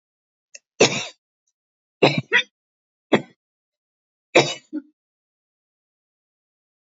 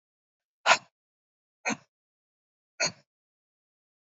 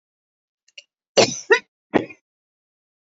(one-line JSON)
{"three_cough_length": "6.9 s", "three_cough_amplitude": 28061, "three_cough_signal_mean_std_ratio": 0.23, "exhalation_length": "4.0 s", "exhalation_amplitude": 19395, "exhalation_signal_mean_std_ratio": 0.19, "cough_length": "3.2 s", "cough_amplitude": 27896, "cough_signal_mean_std_ratio": 0.23, "survey_phase": "beta (2021-08-13 to 2022-03-07)", "age": "65+", "gender": "Female", "wearing_mask": "No", "symptom_shortness_of_breath": true, "symptom_onset": "12 days", "smoker_status": "Never smoked", "respiratory_condition_asthma": false, "respiratory_condition_other": false, "recruitment_source": "REACT", "submission_delay": "2 days", "covid_test_result": "Negative", "covid_test_method": "RT-qPCR", "influenza_a_test_result": "Negative", "influenza_b_test_result": "Negative"}